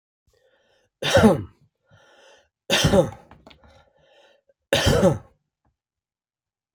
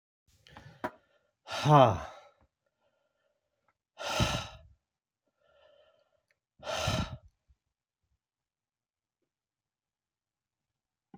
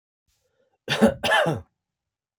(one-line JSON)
{"three_cough_length": "6.7 s", "three_cough_amplitude": 27140, "three_cough_signal_mean_std_ratio": 0.33, "exhalation_length": "11.2 s", "exhalation_amplitude": 16350, "exhalation_signal_mean_std_ratio": 0.23, "cough_length": "2.4 s", "cough_amplitude": 21832, "cough_signal_mean_std_ratio": 0.38, "survey_phase": "beta (2021-08-13 to 2022-03-07)", "age": "65+", "gender": "Male", "wearing_mask": "No", "symptom_none": true, "smoker_status": "Ex-smoker", "respiratory_condition_asthma": false, "respiratory_condition_other": false, "recruitment_source": "REACT", "submission_delay": "1 day", "covid_test_result": "Negative", "covid_test_method": "RT-qPCR"}